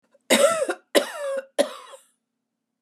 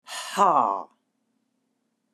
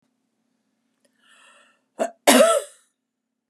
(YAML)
three_cough_length: 2.8 s
three_cough_amplitude: 22916
three_cough_signal_mean_std_ratio: 0.43
exhalation_length: 2.1 s
exhalation_amplitude: 15693
exhalation_signal_mean_std_ratio: 0.37
cough_length: 3.5 s
cough_amplitude: 30509
cough_signal_mean_std_ratio: 0.27
survey_phase: beta (2021-08-13 to 2022-03-07)
age: 65+
gender: Female
wearing_mask: 'No'
symptom_cough_any: true
symptom_fatigue: true
smoker_status: Never smoked
respiratory_condition_asthma: false
respiratory_condition_other: false
recruitment_source: REACT
submission_delay: 2 days
covid_test_result: Negative
covid_test_method: RT-qPCR
influenza_a_test_result: Unknown/Void
influenza_b_test_result: Unknown/Void